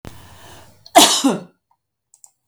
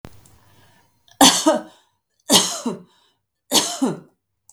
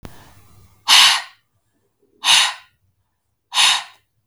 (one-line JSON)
{"cough_length": "2.5 s", "cough_amplitude": 32768, "cough_signal_mean_std_ratio": 0.32, "three_cough_length": "4.5 s", "three_cough_amplitude": 32768, "three_cough_signal_mean_std_ratio": 0.36, "exhalation_length": "4.3 s", "exhalation_amplitude": 32768, "exhalation_signal_mean_std_ratio": 0.37, "survey_phase": "beta (2021-08-13 to 2022-03-07)", "age": "45-64", "gender": "Female", "wearing_mask": "No", "symptom_none": true, "symptom_onset": "12 days", "smoker_status": "Never smoked", "respiratory_condition_asthma": false, "respiratory_condition_other": false, "recruitment_source": "REACT", "submission_delay": "1 day", "covid_test_result": "Negative", "covid_test_method": "RT-qPCR", "influenza_a_test_result": "Negative", "influenza_b_test_result": "Negative"}